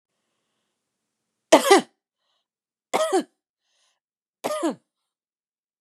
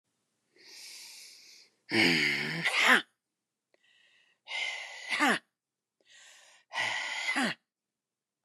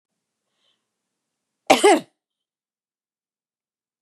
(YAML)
three_cough_length: 5.8 s
three_cough_amplitude: 30591
three_cough_signal_mean_std_ratio: 0.24
exhalation_length: 8.4 s
exhalation_amplitude: 10861
exhalation_signal_mean_std_ratio: 0.43
cough_length: 4.0 s
cough_amplitude: 32767
cough_signal_mean_std_ratio: 0.2
survey_phase: beta (2021-08-13 to 2022-03-07)
age: 45-64
gender: Female
wearing_mask: 'No'
symptom_none: true
smoker_status: Never smoked
respiratory_condition_asthma: false
respiratory_condition_other: false
recruitment_source: REACT
submission_delay: 2 days
covid_test_result: Negative
covid_test_method: RT-qPCR
influenza_a_test_result: Negative
influenza_b_test_result: Negative